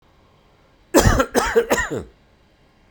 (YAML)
cough_length: 2.9 s
cough_amplitude: 32768
cough_signal_mean_std_ratio: 0.42
survey_phase: beta (2021-08-13 to 2022-03-07)
age: 45-64
gender: Male
wearing_mask: 'No'
symptom_none: true
symptom_onset: 13 days
smoker_status: Ex-smoker
respiratory_condition_asthma: false
respiratory_condition_other: false
recruitment_source: REACT
submission_delay: 1 day
covid_test_result: Negative
covid_test_method: RT-qPCR